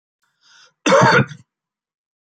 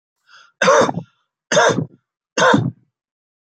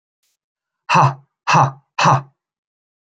{"cough_length": "2.4 s", "cough_amplitude": 27819, "cough_signal_mean_std_ratio": 0.35, "three_cough_length": "3.5 s", "three_cough_amplitude": 29008, "three_cough_signal_mean_std_ratio": 0.44, "exhalation_length": "3.1 s", "exhalation_amplitude": 28283, "exhalation_signal_mean_std_ratio": 0.38, "survey_phase": "beta (2021-08-13 to 2022-03-07)", "age": "45-64", "gender": "Male", "wearing_mask": "No", "symptom_none": true, "smoker_status": "Ex-smoker", "respiratory_condition_asthma": false, "respiratory_condition_other": false, "recruitment_source": "REACT", "submission_delay": "12 days", "covid_test_result": "Negative", "covid_test_method": "RT-qPCR"}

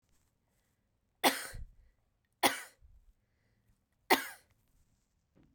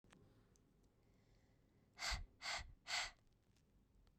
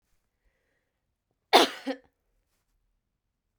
{"three_cough_length": "5.5 s", "three_cough_amplitude": 9163, "three_cough_signal_mean_std_ratio": 0.22, "exhalation_length": "4.2 s", "exhalation_amplitude": 926, "exhalation_signal_mean_std_ratio": 0.4, "cough_length": "3.6 s", "cough_amplitude": 23670, "cough_signal_mean_std_ratio": 0.18, "survey_phase": "beta (2021-08-13 to 2022-03-07)", "age": "18-44", "gender": "Female", "wearing_mask": "No", "symptom_cough_any": true, "symptom_onset": "12 days", "smoker_status": "Never smoked", "respiratory_condition_asthma": false, "respiratory_condition_other": false, "recruitment_source": "REACT", "submission_delay": "2 days", "covid_test_result": "Negative", "covid_test_method": "RT-qPCR"}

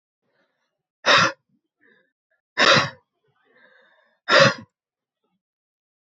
{"exhalation_length": "6.1 s", "exhalation_amplitude": 27109, "exhalation_signal_mean_std_ratio": 0.28, "survey_phase": "beta (2021-08-13 to 2022-03-07)", "age": "45-64", "gender": "Female", "wearing_mask": "No", "symptom_cough_any": true, "symptom_runny_or_blocked_nose": true, "symptom_sore_throat": true, "symptom_fatigue": true, "symptom_fever_high_temperature": true, "symptom_headache": true, "symptom_other": true, "symptom_onset": "3 days", "smoker_status": "Never smoked", "respiratory_condition_asthma": false, "respiratory_condition_other": false, "recruitment_source": "Test and Trace", "submission_delay": "1 day", "covid_test_result": "Positive", "covid_test_method": "RT-qPCR", "covid_ct_value": 13.3, "covid_ct_gene": "ORF1ab gene", "covid_ct_mean": 13.5, "covid_viral_load": "38000000 copies/ml", "covid_viral_load_category": "High viral load (>1M copies/ml)"}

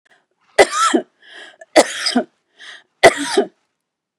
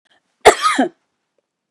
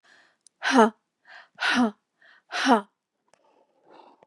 {"three_cough_length": "4.2 s", "three_cough_amplitude": 32768, "three_cough_signal_mean_std_ratio": 0.36, "cough_length": "1.7 s", "cough_amplitude": 32768, "cough_signal_mean_std_ratio": 0.32, "exhalation_length": "4.3 s", "exhalation_amplitude": 23284, "exhalation_signal_mean_std_ratio": 0.33, "survey_phase": "beta (2021-08-13 to 2022-03-07)", "age": "45-64", "gender": "Female", "wearing_mask": "No", "symptom_none": true, "smoker_status": "Ex-smoker", "respiratory_condition_asthma": true, "respiratory_condition_other": false, "recruitment_source": "REACT", "submission_delay": "2 days", "covid_test_result": "Negative", "covid_test_method": "RT-qPCR", "influenza_a_test_result": "Negative", "influenza_b_test_result": "Negative"}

